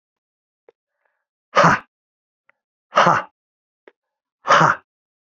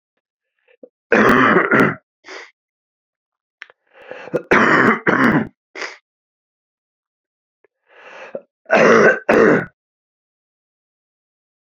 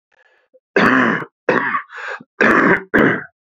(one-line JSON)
{"exhalation_length": "5.2 s", "exhalation_amplitude": 29893, "exhalation_signal_mean_std_ratio": 0.3, "three_cough_length": "11.6 s", "three_cough_amplitude": 32768, "three_cough_signal_mean_std_ratio": 0.4, "cough_length": "3.6 s", "cough_amplitude": 32767, "cough_signal_mean_std_ratio": 0.56, "survey_phase": "beta (2021-08-13 to 2022-03-07)", "age": "45-64", "gender": "Male", "wearing_mask": "No", "symptom_cough_any": true, "symptom_new_continuous_cough": true, "symptom_runny_or_blocked_nose": true, "symptom_abdominal_pain": true, "symptom_fatigue": true, "symptom_headache": true, "symptom_onset": "3 days", "smoker_status": "Ex-smoker", "respiratory_condition_asthma": false, "respiratory_condition_other": false, "recruitment_source": "Test and Trace", "submission_delay": "1 day", "covid_test_result": "Positive", "covid_test_method": "RT-qPCR", "covid_ct_value": 18.7, "covid_ct_gene": "ORF1ab gene"}